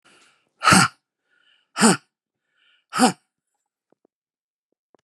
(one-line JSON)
{"exhalation_length": "5.0 s", "exhalation_amplitude": 31392, "exhalation_signal_mean_std_ratio": 0.26, "survey_phase": "beta (2021-08-13 to 2022-03-07)", "age": "65+", "gender": "Male", "wearing_mask": "No", "symptom_cough_any": true, "smoker_status": "Never smoked", "respiratory_condition_asthma": false, "respiratory_condition_other": false, "recruitment_source": "REACT", "submission_delay": "1 day", "covid_test_result": "Negative", "covid_test_method": "RT-qPCR"}